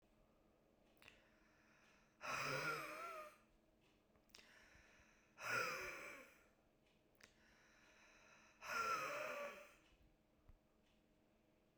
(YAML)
exhalation_length: 11.8 s
exhalation_amplitude: 1073
exhalation_signal_mean_std_ratio: 0.46
survey_phase: beta (2021-08-13 to 2022-03-07)
age: 45-64
gender: Female
wearing_mask: 'No'
symptom_new_continuous_cough: true
symptom_runny_or_blocked_nose: true
symptom_sore_throat: true
symptom_fatigue: true
symptom_fever_high_temperature: true
smoker_status: Prefer not to say
respiratory_condition_asthma: true
respiratory_condition_other: false
recruitment_source: Test and Trace
submission_delay: 3 days
covid_test_result: Positive
covid_test_method: RT-qPCR
covid_ct_value: 34.0
covid_ct_gene: N gene
covid_ct_mean: 34.0
covid_viral_load: 7.1 copies/ml
covid_viral_load_category: Minimal viral load (< 10K copies/ml)